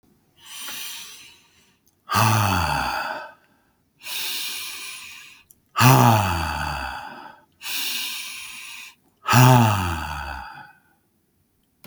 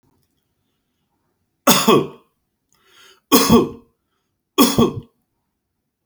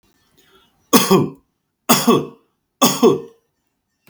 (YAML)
exhalation_length: 11.9 s
exhalation_amplitude: 32768
exhalation_signal_mean_std_ratio: 0.47
three_cough_length: 6.1 s
three_cough_amplitude: 32768
three_cough_signal_mean_std_ratio: 0.33
cough_length: 4.1 s
cough_amplitude: 32768
cough_signal_mean_std_ratio: 0.39
survey_phase: alpha (2021-03-01 to 2021-08-12)
age: 45-64
gender: Male
wearing_mask: 'No'
symptom_none: true
smoker_status: Ex-smoker
respiratory_condition_asthma: false
respiratory_condition_other: false
recruitment_source: REACT
submission_delay: 5 days
covid_test_result: Negative
covid_test_method: RT-qPCR